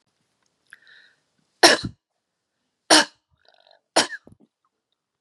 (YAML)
three_cough_length: 5.2 s
three_cough_amplitude: 32768
three_cough_signal_mean_std_ratio: 0.21
survey_phase: beta (2021-08-13 to 2022-03-07)
age: 45-64
gender: Female
wearing_mask: 'No'
symptom_none: true
smoker_status: Never smoked
respiratory_condition_asthma: false
respiratory_condition_other: false
recruitment_source: REACT
submission_delay: 1 day
covid_test_result: Negative
covid_test_method: RT-qPCR